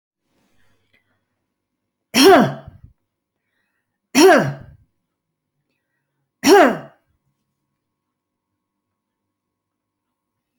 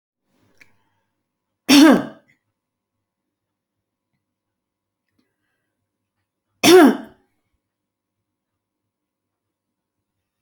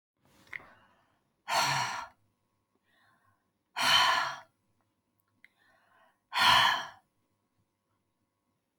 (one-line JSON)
{"three_cough_length": "10.6 s", "three_cough_amplitude": 29740, "three_cough_signal_mean_std_ratio": 0.25, "cough_length": "10.4 s", "cough_amplitude": 28954, "cough_signal_mean_std_ratio": 0.21, "exhalation_length": "8.8 s", "exhalation_amplitude": 9534, "exhalation_signal_mean_std_ratio": 0.34, "survey_phase": "alpha (2021-03-01 to 2021-08-12)", "age": "65+", "gender": "Female", "wearing_mask": "No", "symptom_none": true, "smoker_status": "Never smoked", "respiratory_condition_asthma": false, "respiratory_condition_other": false, "recruitment_source": "REACT", "submission_delay": "1 day", "covid_test_result": "Negative", "covid_test_method": "RT-qPCR"}